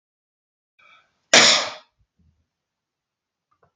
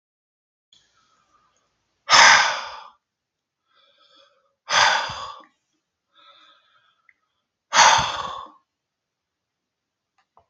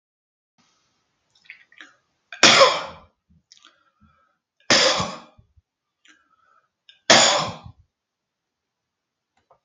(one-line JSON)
{"cough_length": "3.8 s", "cough_amplitude": 32767, "cough_signal_mean_std_ratio": 0.23, "exhalation_length": "10.5 s", "exhalation_amplitude": 32767, "exhalation_signal_mean_std_ratio": 0.28, "three_cough_length": "9.6 s", "three_cough_amplitude": 32767, "three_cough_signal_mean_std_ratio": 0.26, "survey_phase": "beta (2021-08-13 to 2022-03-07)", "age": "65+", "gender": "Male", "wearing_mask": "No", "symptom_none": true, "smoker_status": "Ex-smoker", "respiratory_condition_asthma": false, "respiratory_condition_other": false, "recruitment_source": "REACT", "submission_delay": "1 day", "covid_test_result": "Negative", "covid_test_method": "RT-qPCR", "influenza_a_test_result": "Negative", "influenza_b_test_result": "Negative"}